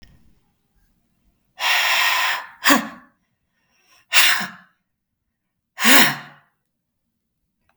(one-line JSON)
{"exhalation_length": "7.8 s", "exhalation_amplitude": 32768, "exhalation_signal_mean_std_ratio": 0.36, "survey_phase": "beta (2021-08-13 to 2022-03-07)", "age": "45-64", "gender": "Female", "wearing_mask": "No", "symptom_none": true, "symptom_onset": "11 days", "smoker_status": "Never smoked", "respiratory_condition_asthma": false, "respiratory_condition_other": false, "recruitment_source": "REACT", "submission_delay": "2 days", "covid_test_result": "Negative", "covid_test_method": "RT-qPCR", "influenza_a_test_result": "Negative", "influenza_b_test_result": "Negative"}